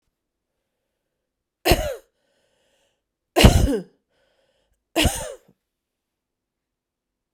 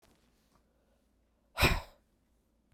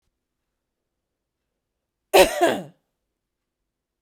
{"three_cough_length": "7.3 s", "three_cough_amplitude": 32768, "three_cough_signal_mean_std_ratio": 0.25, "exhalation_length": "2.7 s", "exhalation_amplitude": 8157, "exhalation_signal_mean_std_ratio": 0.23, "cough_length": "4.0 s", "cough_amplitude": 32767, "cough_signal_mean_std_ratio": 0.22, "survey_phase": "beta (2021-08-13 to 2022-03-07)", "age": "45-64", "gender": "Female", "wearing_mask": "No", "symptom_runny_or_blocked_nose": true, "symptom_sore_throat": true, "symptom_fatigue": true, "smoker_status": "Never smoked", "respiratory_condition_asthma": false, "respiratory_condition_other": false, "recruitment_source": "Test and Trace", "submission_delay": "1 day", "covid_test_result": "Positive", "covid_test_method": "RT-qPCR"}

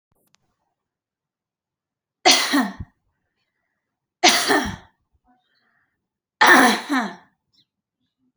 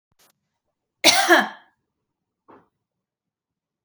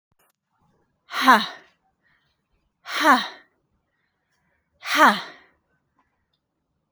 {"three_cough_length": "8.4 s", "three_cough_amplitude": 32306, "three_cough_signal_mean_std_ratio": 0.31, "cough_length": "3.8 s", "cough_amplitude": 31639, "cough_signal_mean_std_ratio": 0.25, "exhalation_length": "6.9 s", "exhalation_amplitude": 27077, "exhalation_signal_mean_std_ratio": 0.27, "survey_phase": "alpha (2021-03-01 to 2021-08-12)", "age": "45-64", "gender": "Female", "wearing_mask": "No", "symptom_none": true, "smoker_status": "Never smoked", "respiratory_condition_asthma": false, "respiratory_condition_other": false, "recruitment_source": "REACT", "submission_delay": "2 days", "covid_test_result": "Negative", "covid_test_method": "RT-qPCR"}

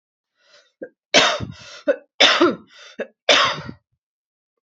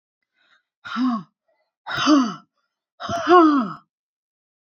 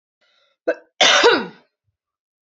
{"three_cough_length": "4.8 s", "three_cough_amplitude": 31720, "three_cough_signal_mean_std_ratio": 0.38, "exhalation_length": "4.6 s", "exhalation_amplitude": 27037, "exhalation_signal_mean_std_ratio": 0.41, "cough_length": "2.6 s", "cough_amplitude": 29133, "cough_signal_mean_std_ratio": 0.35, "survey_phase": "beta (2021-08-13 to 2022-03-07)", "age": "18-44", "gender": "Female", "wearing_mask": "No", "symptom_runny_or_blocked_nose": true, "symptom_onset": "12 days", "smoker_status": "Never smoked", "respiratory_condition_asthma": false, "respiratory_condition_other": false, "recruitment_source": "REACT", "submission_delay": "1 day", "covid_test_result": "Negative", "covid_test_method": "RT-qPCR", "influenza_a_test_result": "Negative", "influenza_b_test_result": "Negative"}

